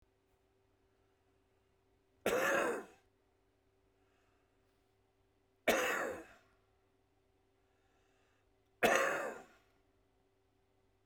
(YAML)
three_cough_length: 11.1 s
three_cough_amplitude: 5772
three_cough_signal_mean_std_ratio: 0.31
survey_phase: beta (2021-08-13 to 2022-03-07)
age: 65+
gender: Male
wearing_mask: 'No'
symptom_runny_or_blocked_nose: true
symptom_headache: true
smoker_status: Current smoker (11 or more cigarettes per day)
respiratory_condition_asthma: false
respiratory_condition_other: true
recruitment_source: Test and Trace
submission_delay: 2 days
covid_test_result: Positive
covid_test_method: RT-qPCR
covid_ct_value: 21.1
covid_ct_gene: N gene